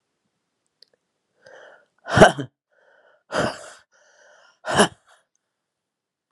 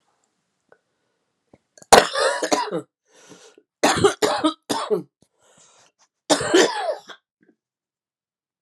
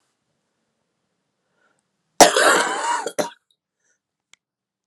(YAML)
exhalation_length: 6.3 s
exhalation_amplitude: 32768
exhalation_signal_mean_std_ratio: 0.22
three_cough_length: 8.6 s
three_cough_amplitude: 32768
three_cough_signal_mean_std_ratio: 0.35
cough_length: 4.9 s
cough_amplitude: 32768
cough_signal_mean_std_ratio: 0.29
survey_phase: beta (2021-08-13 to 2022-03-07)
age: 45-64
gender: Female
wearing_mask: 'No'
symptom_cough_any: true
symptom_runny_or_blocked_nose: true
symptom_shortness_of_breath: true
symptom_sore_throat: true
symptom_fever_high_temperature: true
symptom_headache: true
symptom_change_to_sense_of_smell_or_taste: true
symptom_loss_of_taste: true
symptom_onset: 2 days
smoker_status: Ex-smoker
respiratory_condition_asthma: false
respiratory_condition_other: false
recruitment_source: Test and Trace
submission_delay: 1 day
covid_test_result: Positive
covid_test_method: RT-qPCR
covid_ct_value: 23.9
covid_ct_gene: ORF1ab gene